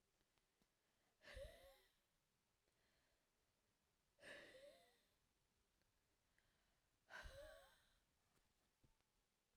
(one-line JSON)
{"exhalation_length": "9.6 s", "exhalation_amplitude": 152, "exhalation_signal_mean_std_ratio": 0.42, "survey_phase": "alpha (2021-03-01 to 2021-08-12)", "age": "18-44", "gender": "Female", "wearing_mask": "No", "symptom_cough_any": true, "symptom_fatigue": true, "smoker_status": "Ex-smoker", "respiratory_condition_asthma": false, "respiratory_condition_other": false, "recruitment_source": "Test and Trace", "submission_delay": "2 days", "covid_test_result": "Positive", "covid_test_method": "RT-qPCR"}